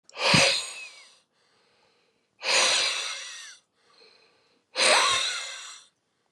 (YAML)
exhalation_length: 6.3 s
exhalation_amplitude: 14989
exhalation_signal_mean_std_ratio: 0.47
survey_phase: beta (2021-08-13 to 2022-03-07)
age: 45-64
gender: Male
wearing_mask: 'No'
symptom_none: true
smoker_status: Current smoker (e-cigarettes or vapes only)
respiratory_condition_asthma: true
respiratory_condition_other: false
recruitment_source: REACT
submission_delay: 1 day
covid_test_result: Negative
covid_test_method: RT-qPCR